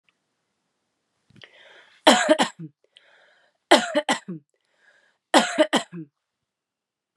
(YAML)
three_cough_length: 7.2 s
three_cough_amplitude: 30420
three_cough_signal_mean_std_ratio: 0.29
survey_phase: beta (2021-08-13 to 2022-03-07)
age: 18-44
gender: Female
wearing_mask: 'Yes'
symptom_cough_any: true
symptom_runny_or_blocked_nose: true
symptom_diarrhoea: true
symptom_headache: true
symptom_change_to_sense_of_smell_or_taste: true
smoker_status: Never smoked
respiratory_condition_asthma: false
respiratory_condition_other: false
recruitment_source: Test and Trace
submission_delay: 1 day
covid_test_result: Positive
covid_test_method: RT-qPCR